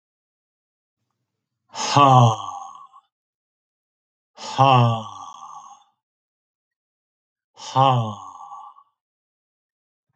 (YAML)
exhalation_length: 10.2 s
exhalation_amplitude: 27814
exhalation_signal_mean_std_ratio: 0.31
survey_phase: alpha (2021-03-01 to 2021-08-12)
age: 45-64
gender: Male
wearing_mask: 'No'
symptom_none: true
symptom_onset: 6 days
smoker_status: Never smoked
respiratory_condition_asthma: false
respiratory_condition_other: false
recruitment_source: REACT
submission_delay: 3 days
covid_test_result: Negative
covid_test_method: RT-qPCR